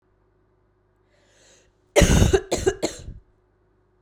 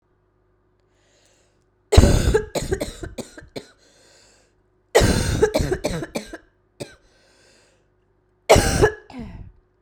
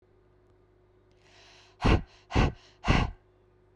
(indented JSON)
{
  "cough_length": "4.0 s",
  "cough_amplitude": 28439,
  "cough_signal_mean_std_ratio": 0.33,
  "three_cough_length": "9.8 s",
  "three_cough_amplitude": 32768,
  "three_cough_signal_mean_std_ratio": 0.36,
  "exhalation_length": "3.8 s",
  "exhalation_amplitude": 12835,
  "exhalation_signal_mean_std_ratio": 0.33,
  "survey_phase": "beta (2021-08-13 to 2022-03-07)",
  "age": "18-44",
  "gender": "Female",
  "wearing_mask": "No",
  "symptom_cough_any": true,
  "symptom_runny_or_blocked_nose": true,
  "symptom_onset": "3 days",
  "smoker_status": "Never smoked",
  "respiratory_condition_asthma": false,
  "respiratory_condition_other": false,
  "recruitment_source": "Test and Trace",
  "submission_delay": "2 days",
  "covid_test_result": "Positive",
  "covid_test_method": "RT-qPCR",
  "covid_ct_value": 19.9,
  "covid_ct_gene": "N gene"
}